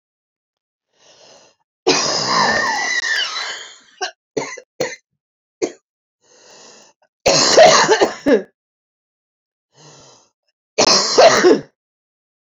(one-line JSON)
{"three_cough_length": "12.5 s", "three_cough_amplitude": 32768, "three_cough_signal_mean_std_ratio": 0.42, "survey_phase": "beta (2021-08-13 to 2022-03-07)", "age": "18-44", "gender": "Female", "wearing_mask": "No", "symptom_cough_any": true, "symptom_fatigue": true, "symptom_headache": true, "symptom_onset": "2 days", "smoker_status": "Never smoked", "respiratory_condition_asthma": false, "respiratory_condition_other": false, "recruitment_source": "Test and Trace", "submission_delay": "2 days", "covid_test_result": "Positive", "covid_test_method": "RT-qPCR"}